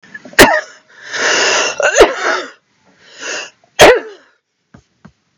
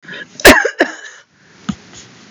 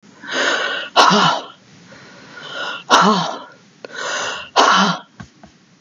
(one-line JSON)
{"three_cough_length": "5.4 s", "three_cough_amplitude": 32768, "three_cough_signal_mean_std_ratio": 0.44, "cough_length": "2.3 s", "cough_amplitude": 32768, "cough_signal_mean_std_ratio": 0.34, "exhalation_length": "5.8 s", "exhalation_amplitude": 32768, "exhalation_signal_mean_std_ratio": 0.54, "survey_phase": "beta (2021-08-13 to 2022-03-07)", "age": "65+", "gender": "Female", "wearing_mask": "No", "symptom_none": true, "smoker_status": "Ex-smoker", "respiratory_condition_asthma": false, "respiratory_condition_other": false, "recruitment_source": "REACT", "submission_delay": "2 days", "covid_test_result": "Negative", "covid_test_method": "RT-qPCR", "influenza_a_test_result": "Negative", "influenza_b_test_result": "Negative"}